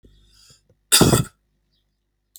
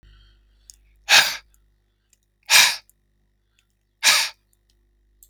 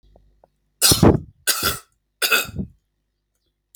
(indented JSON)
{
  "cough_length": "2.4 s",
  "cough_amplitude": 32768,
  "cough_signal_mean_std_ratio": 0.28,
  "exhalation_length": "5.3 s",
  "exhalation_amplitude": 32768,
  "exhalation_signal_mean_std_ratio": 0.28,
  "three_cough_length": "3.8 s",
  "three_cough_amplitude": 29155,
  "three_cough_signal_mean_std_ratio": 0.36,
  "survey_phase": "alpha (2021-03-01 to 2021-08-12)",
  "age": "45-64",
  "gender": "Male",
  "wearing_mask": "No",
  "symptom_headache": true,
  "smoker_status": "Ex-smoker",
  "respiratory_condition_asthma": true,
  "respiratory_condition_other": false,
  "recruitment_source": "REACT",
  "submission_delay": "1 day",
  "covid_test_result": "Negative",
  "covid_test_method": "RT-qPCR"
}